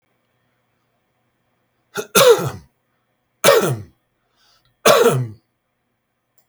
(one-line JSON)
{"three_cough_length": "6.5 s", "three_cough_amplitude": 32768, "three_cough_signal_mean_std_ratio": 0.33, "survey_phase": "beta (2021-08-13 to 2022-03-07)", "age": "45-64", "gender": "Male", "wearing_mask": "No", "symptom_none": true, "smoker_status": "Never smoked", "respiratory_condition_asthma": false, "respiratory_condition_other": false, "recruitment_source": "REACT", "submission_delay": "0 days", "covid_test_method": "RT-qPCR", "influenza_a_test_result": "Unknown/Void", "influenza_b_test_result": "Unknown/Void"}